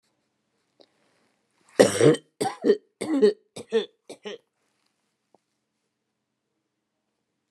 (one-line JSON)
{"cough_length": "7.5 s", "cough_amplitude": 29573, "cough_signal_mean_std_ratio": 0.27, "survey_phase": "beta (2021-08-13 to 2022-03-07)", "age": "65+", "gender": "Female", "wearing_mask": "No", "symptom_none": true, "smoker_status": "Never smoked", "respiratory_condition_asthma": false, "respiratory_condition_other": false, "recruitment_source": "REACT", "submission_delay": "2 days", "covid_test_result": "Negative", "covid_test_method": "RT-qPCR", "influenza_a_test_result": "Unknown/Void", "influenza_b_test_result": "Unknown/Void"}